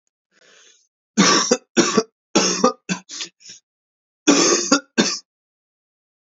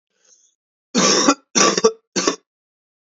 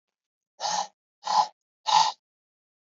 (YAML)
three_cough_length: 6.3 s
three_cough_amplitude: 29506
three_cough_signal_mean_std_ratio: 0.42
cough_length: 3.2 s
cough_amplitude: 32768
cough_signal_mean_std_ratio: 0.42
exhalation_length: 3.0 s
exhalation_amplitude: 13881
exhalation_signal_mean_std_ratio: 0.36
survey_phase: beta (2021-08-13 to 2022-03-07)
age: 18-44
gender: Male
wearing_mask: 'No'
symptom_cough_any: true
symptom_runny_or_blocked_nose: true
symptom_sore_throat: true
smoker_status: Never smoked
respiratory_condition_asthma: false
respiratory_condition_other: false
recruitment_source: Test and Trace
submission_delay: 1 day
covid_test_result: Positive
covid_test_method: RT-qPCR
covid_ct_value: 30.0
covid_ct_gene: ORF1ab gene